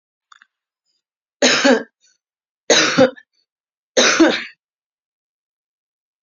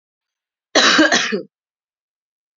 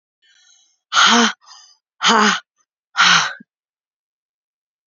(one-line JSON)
{"three_cough_length": "6.2 s", "three_cough_amplitude": 31939, "three_cough_signal_mean_std_ratio": 0.35, "cough_length": "2.6 s", "cough_amplitude": 32767, "cough_signal_mean_std_ratio": 0.39, "exhalation_length": "4.9 s", "exhalation_amplitude": 31455, "exhalation_signal_mean_std_ratio": 0.38, "survey_phase": "beta (2021-08-13 to 2022-03-07)", "age": "45-64", "gender": "Female", "wearing_mask": "No", "symptom_sore_throat": true, "symptom_fatigue": true, "symptom_onset": "2 days", "smoker_status": "Never smoked", "respiratory_condition_asthma": false, "respiratory_condition_other": false, "recruitment_source": "Test and Trace", "submission_delay": "1 day", "covid_test_result": "Positive", "covid_test_method": "RT-qPCR", "covid_ct_value": 18.2, "covid_ct_gene": "N gene"}